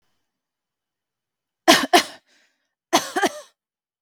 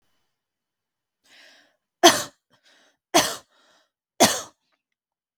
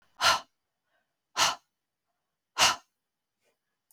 cough_length: 4.0 s
cough_amplitude: 32768
cough_signal_mean_std_ratio: 0.26
three_cough_length: 5.4 s
three_cough_amplitude: 32768
three_cough_signal_mean_std_ratio: 0.22
exhalation_length: 3.9 s
exhalation_amplitude: 11948
exhalation_signal_mean_std_ratio: 0.28
survey_phase: beta (2021-08-13 to 2022-03-07)
age: 45-64
gender: Female
wearing_mask: 'No'
symptom_none: true
smoker_status: Never smoked
respiratory_condition_asthma: false
respiratory_condition_other: false
recruitment_source: REACT
submission_delay: 2 days
covid_test_result: Negative
covid_test_method: RT-qPCR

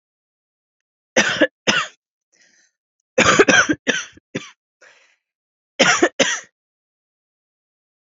three_cough_length: 8.0 s
three_cough_amplitude: 32768
three_cough_signal_mean_std_ratio: 0.34
survey_phase: alpha (2021-03-01 to 2021-08-12)
age: 18-44
gender: Female
wearing_mask: 'No'
symptom_cough_any: true
symptom_fatigue: true
symptom_headache: true
symptom_onset: 3 days
smoker_status: Never smoked
respiratory_condition_asthma: false
respiratory_condition_other: false
recruitment_source: Test and Trace
submission_delay: 1 day
covid_test_result: Positive
covid_test_method: RT-qPCR
covid_ct_value: 20.3
covid_ct_gene: ORF1ab gene
covid_ct_mean: 20.5
covid_viral_load: 180000 copies/ml
covid_viral_load_category: Low viral load (10K-1M copies/ml)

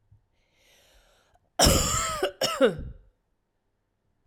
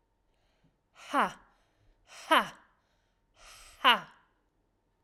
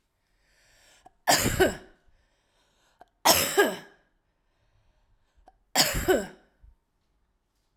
cough_length: 4.3 s
cough_amplitude: 15335
cough_signal_mean_std_ratio: 0.38
exhalation_length: 5.0 s
exhalation_amplitude: 14918
exhalation_signal_mean_std_ratio: 0.24
three_cough_length: 7.8 s
three_cough_amplitude: 20363
three_cough_signal_mean_std_ratio: 0.32
survey_phase: alpha (2021-03-01 to 2021-08-12)
age: 45-64
gender: Female
wearing_mask: 'No'
symptom_fatigue: true
symptom_fever_high_temperature: true
symptom_headache: true
smoker_status: Current smoker (e-cigarettes or vapes only)
respiratory_condition_asthma: false
respiratory_condition_other: false
recruitment_source: Test and Trace
submission_delay: 2 days
covid_test_result: Positive
covid_test_method: RT-qPCR
covid_ct_value: 18.3
covid_ct_gene: ORF1ab gene
covid_ct_mean: 18.9
covid_viral_load: 630000 copies/ml
covid_viral_load_category: Low viral load (10K-1M copies/ml)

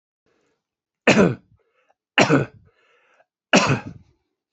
three_cough_length: 4.5 s
three_cough_amplitude: 28936
three_cough_signal_mean_std_ratio: 0.32
survey_phase: beta (2021-08-13 to 2022-03-07)
age: 45-64
gender: Male
wearing_mask: 'No'
symptom_cough_any: true
symptom_shortness_of_breath: true
symptom_headache: true
symptom_onset: 12 days
smoker_status: Never smoked
respiratory_condition_asthma: false
respiratory_condition_other: false
recruitment_source: REACT
submission_delay: 1 day
covid_test_result: Negative
covid_test_method: RT-qPCR
influenza_a_test_result: Negative
influenza_b_test_result: Negative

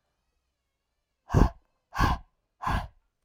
exhalation_length: 3.2 s
exhalation_amplitude: 22823
exhalation_signal_mean_std_ratio: 0.31
survey_phase: alpha (2021-03-01 to 2021-08-12)
age: 18-44
gender: Female
wearing_mask: 'No'
symptom_none: true
symptom_onset: 12 days
smoker_status: Never smoked
respiratory_condition_asthma: true
respiratory_condition_other: false
recruitment_source: REACT
submission_delay: 1 day
covid_test_result: Negative
covid_test_method: RT-qPCR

